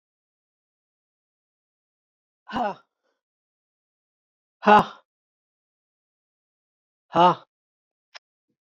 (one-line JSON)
{"exhalation_length": "8.7 s", "exhalation_amplitude": 24489, "exhalation_signal_mean_std_ratio": 0.18, "survey_phase": "beta (2021-08-13 to 2022-03-07)", "age": "45-64", "gender": "Female", "wearing_mask": "No", "symptom_none": true, "smoker_status": "Never smoked", "respiratory_condition_asthma": false, "respiratory_condition_other": false, "recruitment_source": "REACT", "submission_delay": "2 days", "covid_test_result": "Negative", "covid_test_method": "RT-qPCR"}